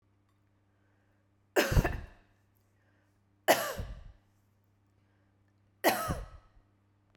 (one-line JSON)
{"three_cough_length": "7.2 s", "three_cough_amplitude": 11574, "three_cough_signal_mean_std_ratio": 0.29, "survey_phase": "beta (2021-08-13 to 2022-03-07)", "age": "45-64", "gender": "Female", "wearing_mask": "No", "symptom_none": true, "smoker_status": "Never smoked", "respiratory_condition_asthma": false, "respiratory_condition_other": false, "recruitment_source": "REACT", "submission_delay": "1 day", "covid_test_result": "Negative", "covid_test_method": "RT-qPCR"}